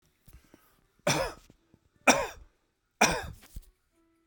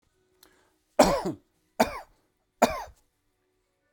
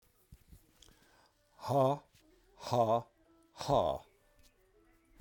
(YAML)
three_cough_length: 4.3 s
three_cough_amplitude: 20149
three_cough_signal_mean_std_ratio: 0.3
cough_length: 3.9 s
cough_amplitude: 20449
cough_signal_mean_std_ratio: 0.27
exhalation_length: 5.2 s
exhalation_amplitude: 4575
exhalation_signal_mean_std_ratio: 0.37
survey_phase: beta (2021-08-13 to 2022-03-07)
age: 65+
gender: Male
wearing_mask: 'No'
symptom_none: true
smoker_status: Ex-smoker
respiratory_condition_asthma: false
respiratory_condition_other: false
recruitment_source: REACT
submission_delay: 2 days
covid_test_result: Negative
covid_test_method: RT-qPCR